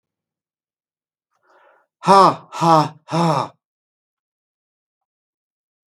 {
  "exhalation_length": "5.9 s",
  "exhalation_amplitude": 32768,
  "exhalation_signal_mean_std_ratio": 0.3,
  "survey_phase": "beta (2021-08-13 to 2022-03-07)",
  "age": "65+",
  "gender": "Male",
  "wearing_mask": "No",
  "symptom_none": true,
  "smoker_status": "Ex-smoker",
  "respiratory_condition_asthma": false,
  "respiratory_condition_other": false,
  "recruitment_source": "REACT",
  "submission_delay": "7 days",
  "covid_test_result": "Negative",
  "covid_test_method": "RT-qPCR",
  "influenza_a_test_result": "Negative",
  "influenza_b_test_result": "Negative"
}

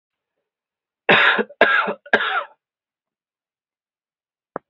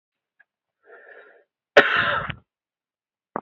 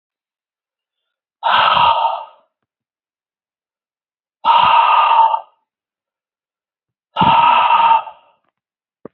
{
  "three_cough_length": "4.7 s",
  "three_cough_amplitude": 32767,
  "three_cough_signal_mean_std_ratio": 0.34,
  "cough_length": "3.4 s",
  "cough_amplitude": 27698,
  "cough_signal_mean_std_ratio": 0.26,
  "exhalation_length": "9.1 s",
  "exhalation_amplitude": 30430,
  "exhalation_signal_mean_std_ratio": 0.46,
  "survey_phase": "beta (2021-08-13 to 2022-03-07)",
  "age": "18-44",
  "gender": "Male",
  "wearing_mask": "No",
  "symptom_runny_or_blocked_nose": true,
  "symptom_fatigue": true,
  "symptom_onset": "5 days",
  "smoker_status": "Never smoked",
  "respiratory_condition_asthma": true,
  "respiratory_condition_other": false,
  "recruitment_source": "REACT",
  "submission_delay": "1 day",
  "covid_test_result": "Negative",
  "covid_test_method": "RT-qPCR"
}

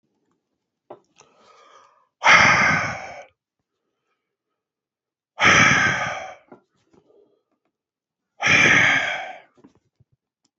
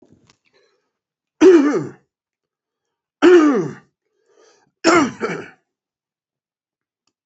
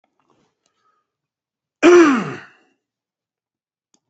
{
  "exhalation_length": "10.6 s",
  "exhalation_amplitude": 28239,
  "exhalation_signal_mean_std_ratio": 0.38,
  "three_cough_length": "7.3 s",
  "three_cough_amplitude": 30178,
  "three_cough_signal_mean_std_ratio": 0.33,
  "cough_length": "4.1 s",
  "cough_amplitude": 28527,
  "cough_signal_mean_std_ratio": 0.27,
  "survey_phase": "beta (2021-08-13 to 2022-03-07)",
  "age": "65+",
  "gender": "Male",
  "wearing_mask": "No",
  "symptom_cough_any": true,
  "symptom_runny_or_blocked_nose": true,
  "symptom_change_to_sense_of_smell_or_taste": true,
  "smoker_status": "Never smoked",
  "respiratory_condition_asthma": false,
  "respiratory_condition_other": false,
  "recruitment_source": "Test and Trace",
  "submission_delay": "2 days",
  "covid_test_result": "Positive",
  "covid_test_method": "RT-qPCR",
  "covid_ct_value": 26.4,
  "covid_ct_gene": "N gene"
}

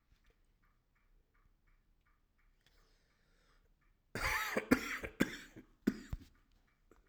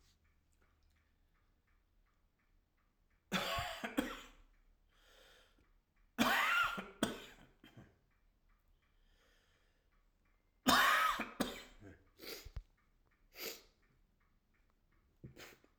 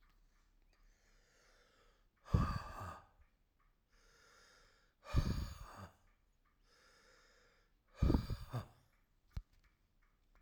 {
  "cough_length": "7.1 s",
  "cough_amplitude": 7533,
  "cough_signal_mean_std_ratio": 0.28,
  "three_cough_length": "15.8 s",
  "three_cough_amplitude": 5865,
  "three_cough_signal_mean_std_ratio": 0.32,
  "exhalation_length": "10.4 s",
  "exhalation_amplitude": 3681,
  "exhalation_signal_mean_std_ratio": 0.29,
  "survey_phase": "alpha (2021-03-01 to 2021-08-12)",
  "age": "45-64",
  "gender": "Male",
  "wearing_mask": "Yes",
  "symptom_cough_any": true,
  "symptom_shortness_of_breath": true,
  "symptom_abdominal_pain": true,
  "symptom_fatigue": true,
  "symptom_change_to_sense_of_smell_or_taste": true,
  "symptom_loss_of_taste": true,
  "symptom_onset": "3 days",
  "smoker_status": "Never smoked",
  "respiratory_condition_asthma": true,
  "respiratory_condition_other": false,
  "recruitment_source": "Test and Trace",
  "submission_delay": "2 days",
  "covid_test_result": "Positive",
  "covid_test_method": "RT-qPCR",
  "covid_ct_value": 24.8,
  "covid_ct_gene": "ORF1ab gene",
  "covid_ct_mean": 25.5,
  "covid_viral_load": "4200 copies/ml",
  "covid_viral_load_category": "Minimal viral load (< 10K copies/ml)"
}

